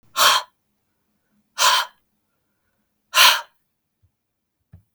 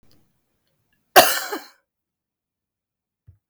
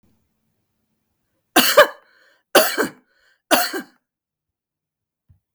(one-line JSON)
{"exhalation_length": "4.9 s", "exhalation_amplitude": 32768, "exhalation_signal_mean_std_ratio": 0.3, "cough_length": "3.5 s", "cough_amplitude": 32768, "cough_signal_mean_std_ratio": 0.2, "three_cough_length": "5.5 s", "three_cough_amplitude": 32768, "three_cough_signal_mean_std_ratio": 0.27, "survey_phase": "beta (2021-08-13 to 2022-03-07)", "age": "65+", "gender": "Female", "wearing_mask": "No", "symptom_none": true, "smoker_status": "Never smoked", "respiratory_condition_asthma": false, "respiratory_condition_other": false, "recruitment_source": "REACT", "submission_delay": "4 days", "covid_test_result": "Negative", "covid_test_method": "RT-qPCR", "influenza_a_test_result": "Negative", "influenza_b_test_result": "Negative"}